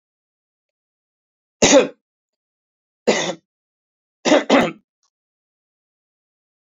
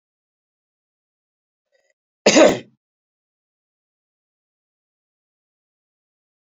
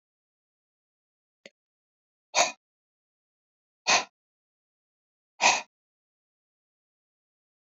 {"three_cough_length": "6.7 s", "three_cough_amplitude": 32171, "three_cough_signal_mean_std_ratio": 0.27, "cough_length": "6.5 s", "cough_amplitude": 29700, "cough_signal_mean_std_ratio": 0.16, "exhalation_length": "7.7 s", "exhalation_amplitude": 15576, "exhalation_signal_mean_std_ratio": 0.19, "survey_phase": "beta (2021-08-13 to 2022-03-07)", "age": "65+", "gender": "Male", "wearing_mask": "No", "symptom_none": true, "symptom_onset": "3 days", "smoker_status": "Ex-smoker", "respiratory_condition_asthma": false, "respiratory_condition_other": false, "recruitment_source": "REACT", "submission_delay": "1 day", "covid_test_result": "Negative", "covid_test_method": "RT-qPCR", "influenza_a_test_result": "Negative", "influenza_b_test_result": "Negative"}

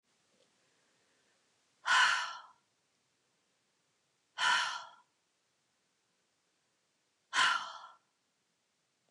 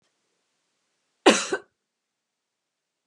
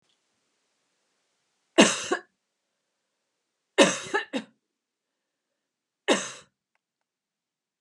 {"exhalation_length": "9.1 s", "exhalation_amplitude": 5233, "exhalation_signal_mean_std_ratio": 0.29, "cough_length": "3.1 s", "cough_amplitude": 28609, "cough_signal_mean_std_ratio": 0.19, "three_cough_length": "7.8 s", "three_cough_amplitude": 25157, "three_cough_signal_mean_std_ratio": 0.22, "survey_phase": "beta (2021-08-13 to 2022-03-07)", "age": "45-64", "gender": "Female", "wearing_mask": "No", "symptom_none": true, "smoker_status": "Never smoked", "respiratory_condition_asthma": false, "respiratory_condition_other": false, "recruitment_source": "REACT", "submission_delay": "1 day", "covid_test_result": "Negative", "covid_test_method": "RT-qPCR", "influenza_a_test_result": "Negative", "influenza_b_test_result": "Negative"}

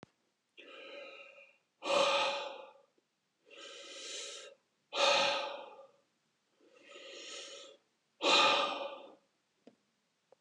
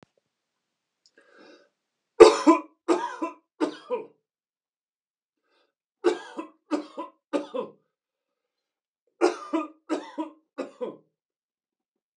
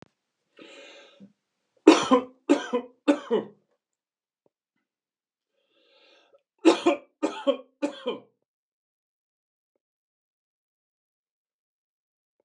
{"exhalation_length": "10.4 s", "exhalation_amplitude": 6525, "exhalation_signal_mean_std_ratio": 0.41, "three_cough_length": "12.2 s", "three_cough_amplitude": 32768, "three_cough_signal_mean_std_ratio": 0.24, "cough_length": "12.4 s", "cough_amplitude": 31037, "cough_signal_mean_std_ratio": 0.23, "survey_phase": "beta (2021-08-13 to 2022-03-07)", "age": "65+", "gender": "Male", "wearing_mask": "No", "symptom_none": true, "smoker_status": "Never smoked", "respiratory_condition_asthma": false, "respiratory_condition_other": false, "recruitment_source": "REACT", "submission_delay": "1 day", "covid_test_result": "Negative", "covid_test_method": "RT-qPCR", "influenza_a_test_result": "Negative", "influenza_b_test_result": "Negative"}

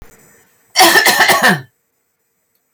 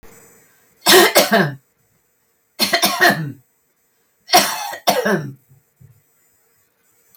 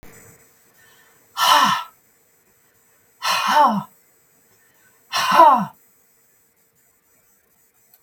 {"cough_length": "2.7 s", "cough_amplitude": 32768, "cough_signal_mean_std_ratio": 0.48, "three_cough_length": "7.2 s", "three_cough_amplitude": 32768, "three_cough_signal_mean_std_ratio": 0.4, "exhalation_length": "8.0 s", "exhalation_amplitude": 32768, "exhalation_signal_mean_std_ratio": 0.35, "survey_phase": "beta (2021-08-13 to 2022-03-07)", "age": "65+", "gender": "Female", "wearing_mask": "No", "symptom_runny_or_blocked_nose": true, "symptom_onset": "3 days", "smoker_status": "Never smoked", "respiratory_condition_asthma": false, "respiratory_condition_other": false, "recruitment_source": "REACT", "submission_delay": "2 days", "covid_test_result": "Negative", "covid_test_method": "RT-qPCR"}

